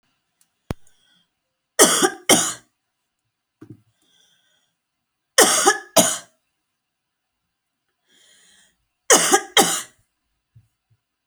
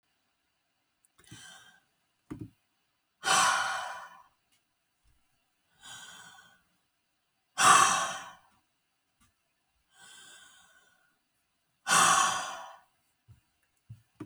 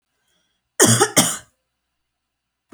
{
  "three_cough_length": "11.3 s",
  "three_cough_amplitude": 32768,
  "three_cough_signal_mean_std_ratio": 0.29,
  "exhalation_length": "14.3 s",
  "exhalation_amplitude": 13692,
  "exhalation_signal_mean_std_ratio": 0.29,
  "cough_length": "2.7 s",
  "cough_amplitude": 32768,
  "cough_signal_mean_std_ratio": 0.31,
  "survey_phase": "beta (2021-08-13 to 2022-03-07)",
  "age": "18-44",
  "gender": "Female",
  "wearing_mask": "No",
  "symptom_other": true,
  "smoker_status": "Never smoked",
  "respiratory_condition_asthma": false,
  "respiratory_condition_other": false,
  "recruitment_source": "Test and Trace",
  "submission_delay": "2 days",
  "covid_test_result": "Positive",
  "covid_test_method": "RT-qPCR",
  "covid_ct_value": 17.4,
  "covid_ct_gene": "N gene",
  "covid_ct_mean": 18.1,
  "covid_viral_load": "1200000 copies/ml",
  "covid_viral_load_category": "High viral load (>1M copies/ml)"
}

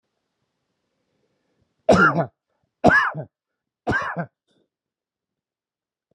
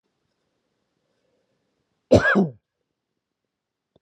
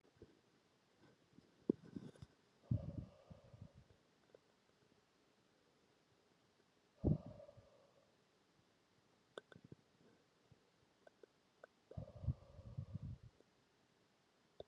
{
  "three_cough_length": "6.1 s",
  "three_cough_amplitude": 30173,
  "three_cough_signal_mean_std_ratio": 0.3,
  "cough_length": "4.0 s",
  "cough_amplitude": 24363,
  "cough_signal_mean_std_ratio": 0.23,
  "exhalation_length": "14.7 s",
  "exhalation_amplitude": 2978,
  "exhalation_signal_mean_std_ratio": 0.25,
  "survey_phase": "alpha (2021-03-01 to 2021-08-12)",
  "age": "45-64",
  "gender": "Male",
  "wearing_mask": "No",
  "symptom_none": true,
  "smoker_status": "Never smoked",
  "respiratory_condition_asthma": false,
  "respiratory_condition_other": false,
  "recruitment_source": "REACT",
  "submission_delay": "5 days",
  "covid_test_result": "Negative",
  "covid_test_method": "RT-qPCR"
}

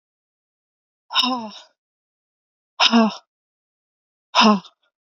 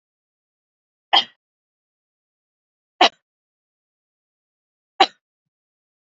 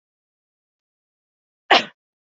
{
  "exhalation_length": "5.0 s",
  "exhalation_amplitude": 28647,
  "exhalation_signal_mean_std_ratio": 0.32,
  "three_cough_length": "6.1 s",
  "three_cough_amplitude": 29552,
  "three_cough_signal_mean_std_ratio": 0.14,
  "cough_length": "2.4 s",
  "cough_amplitude": 28565,
  "cough_signal_mean_std_ratio": 0.17,
  "survey_phase": "beta (2021-08-13 to 2022-03-07)",
  "age": "18-44",
  "gender": "Female",
  "wearing_mask": "No",
  "symptom_cough_any": true,
  "symptom_new_continuous_cough": true,
  "symptom_runny_or_blocked_nose": true,
  "symptom_shortness_of_breath": true,
  "symptom_sore_throat": true,
  "symptom_fatigue": true,
  "symptom_fever_high_temperature": true,
  "symptom_headache": true,
  "symptom_onset": "2 days",
  "smoker_status": "Never smoked",
  "respiratory_condition_asthma": false,
  "respiratory_condition_other": false,
  "recruitment_source": "Test and Trace",
  "submission_delay": "2 days",
  "covid_test_result": "Positive",
  "covid_test_method": "RT-qPCR",
  "covid_ct_value": 22.1,
  "covid_ct_gene": "ORF1ab gene",
  "covid_ct_mean": 22.6,
  "covid_viral_load": "40000 copies/ml",
  "covid_viral_load_category": "Low viral load (10K-1M copies/ml)"
}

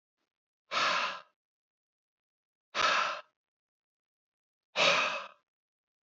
{
  "exhalation_length": "6.1 s",
  "exhalation_amplitude": 8721,
  "exhalation_signal_mean_std_ratio": 0.37,
  "survey_phase": "beta (2021-08-13 to 2022-03-07)",
  "age": "65+",
  "gender": "Male",
  "wearing_mask": "No",
  "symptom_none": true,
  "smoker_status": "Never smoked",
  "respiratory_condition_asthma": false,
  "respiratory_condition_other": false,
  "recruitment_source": "REACT",
  "submission_delay": "2 days",
  "covid_test_result": "Negative",
  "covid_test_method": "RT-qPCR",
  "influenza_a_test_result": "Negative",
  "influenza_b_test_result": "Negative"
}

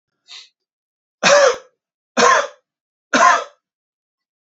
{
  "three_cough_length": "4.5 s",
  "three_cough_amplitude": 29154,
  "three_cough_signal_mean_std_ratio": 0.37,
  "survey_phase": "beta (2021-08-13 to 2022-03-07)",
  "age": "18-44",
  "gender": "Male",
  "wearing_mask": "No",
  "symptom_none": true,
  "smoker_status": "Never smoked",
  "respiratory_condition_asthma": false,
  "respiratory_condition_other": false,
  "recruitment_source": "Test and Trace",
  "submission_delay": "0 days",
  "covid_test_result": "Negative",
  "covid_test_method": "LFT"
}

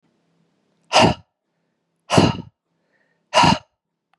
{
  "exhalation_length": "4.2 s",
  "exhalation_amplitude": 32482,
  "exhalation_signal_mean_std_ratio": 0.32,
  "survey_phase": "beta (2021-08-13 to 2022-03-07)",
  "age": "18-44",
  "gender": "Male",
  "wearing_mask": "No",
  "symptom_sore_throat": true,
  "symptom_headache": true,
  "symptom_onset": "11 days",
  "smoker_status": "Never smoked",
  "respiratory_condition_asthma": false,
  "respiratory_condition_other": false,
  "recruitment_source": "REACT",
  "submission_delay": "2 days",
  "covid_test_result": "Negative",
  "covid_test_method": "RT-qPCR"
}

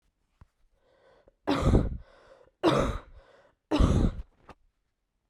{
  "three_cough_length": "5.3 s",
  "three_cough_amplitude": 12129,
  "three_cough_signal_mean_std_ratio": 0.4,
  "survey_phase": "beta (2021-08-13 to 2022-03-07)",
  "age": "18-44",
  "gender": "Female",
  "wearing_mask": "No",
  "symptom_cough_any": true,
  "symptom_runny_or_blocked_nose": true,
  "symptom_fatigue": true,
  "symptom_fever_high_temperature": true,
  "symptom_headache": true,
  "symptom_onset": "3 days",
  "smoker_status": "Never smoked",
  "respiratory_condition_asthma": false,
  "respiratory_condition_other": false,
  "recruitment_source": "Test and Trace",
  "submission_delay": "2 days",
  "covid_test_result": "Positive",
  "covid_test_method": "RT-qPCR",
  "covid_ct_value": 20.7,
  "covid_ct_gene": "ORF1ab gene"
}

